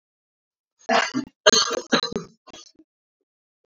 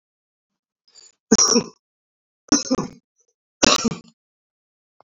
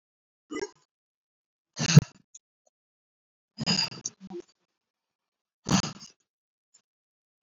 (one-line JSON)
{"cough_length": "3.7 s", "cough_amplitude": 29016, "cough_signal_mean_std_ratio": 0.33, "three_cough_length": "5.0 s", "three_cough_amplitude": 30977, "three_cough_signal_mean_std_ratio": 0.3, "exhalation_length": "7.4 s", "exhalation_amplitude": 26223, "exhalation_signal_mean_std_ratio": 0.19, "survey_phase": "beta (2021-08-13 to 2022-03-07)", "age": "18-44", "gender": "Male", "wearing_mask": "No", "symptom_none": true, "smoker_status": "Current smoker (1 to 10 cigarettes per day)", "respiratory_condition_asthma": false, "respiratory_condition_other": false, "recruitment_source": "REACT", "submission_delay": "4 days", "covid_test_result": "Negative", "covid_test_method": "RT-qPCR", "influenza_a_test_result": "Unknown/Void", "influenza_b_test_result": "Unknown/Void"}